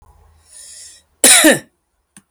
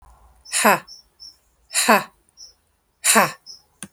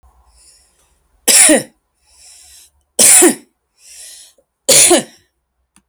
{"cough_length": "2.3 s", "cough_amplitude": 32768, "cough_signal_mean_std_ratio": 0.34, "exhalation_length": "3.9 s", "exhalation_amplitude": 30556, "exhalation_signal_mean_std_ratio": 0.36, "three_cough_length": "5.9 s", "three_cough_amplitude": 32768, "three_cough_signal_mean_std_ratio": 0.37, "survey_phase": "beta (2021-08-13 to 2022-03-07)", "age": "45-64", "gender": "Female", "wearing_mask": "No", "symptom_none": true, "smoker_status": "Never smoked", "respiratory_condition_asthma": true, "respiratory_condition_other": false, "recruitment_source": "REACT", "submission_delay": "8 days", "covid_test_result": "Negative", "covid_test_method": "RT-qPCR"}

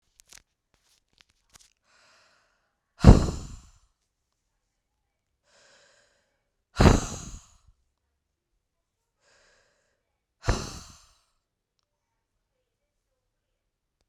{"exhalation_length": "14.1 s", "exhalation_amplitude": 32767, "exhalation_signal_mean_std_ratio": 0.15, "survey_phase": "beta (2021-08-13 to 2022-03-07)", "age": "18-44", "gender": "Female", "wearing_mask": "No", "symptom_runny_or_blocked_nose": true, "symptom_headache": true, "symptom_change_to_sense_of_smell_or_taste": true, "symptom_loss_of_taste": true, "symptom_onset": "2 days", "smoker_status": "Never smoked", "respiratory_condition_asthma": false, "respiratory_condition_other": false, "recruitment_source": "Test and Trace", "submission_delay": "2 days", "covid_test_result": "Positive", "covid_test_method": "RT-qPCR", "covid_ct_value": 22.4, "covid_ct_gene": "ORF1ab gene"}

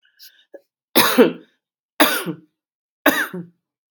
{"three_cough_length": "3.9 s", "three_cough_amplitude": 32768, "three_cough_signal_mean_std_ratio": 0.35, "survey_phase": "beta (2021-08-13 to 2022-03-07)", "age": "65+", "gender": "Female", "wearing_mask": "No", "symptom_cough_any": true, "symptom_runny_or_blocked_nose": true, "smoker_status": "Never smoked", "respiratory_condition_asthma": false, "respiratory_condition_other": false, "recruitment_source": "Test and Trace", "submission_delay": "3 days", "covid_test_result": "Positive", "covid_test_method": "LFT"}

